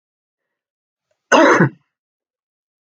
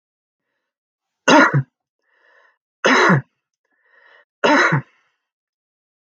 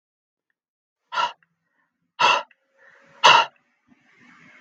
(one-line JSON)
{"cough_length": "2.9 s", "cough_amplitude": 32768, "cough_signal_mean_std_ratio": 0.29, "three_cough_length": "6.1 s", "three_cough_amplitude": 32768, "three_cough_signal_mean_std_ratio": 0.34, "exhalation_length": "4.6 s", "exhalation_amplitude": 32768, "exhalation_signal_mean_std_ratio": 0.27, "survey_phase": "beta (2021-08-13 to 2022-03-07)", "age": "45-64", "gender": "Male", "wearing_mask": "No", "symptom_none": true, "smoker_status": "Ex-smoker", "respiratory_condition_asthma": false, "respiratory_condition_other": false, "recruitment_source": "REACT", "submission_delay": "1 day", "covid_test_result": "Negative", "covid_test_method": "RT-qPCR"}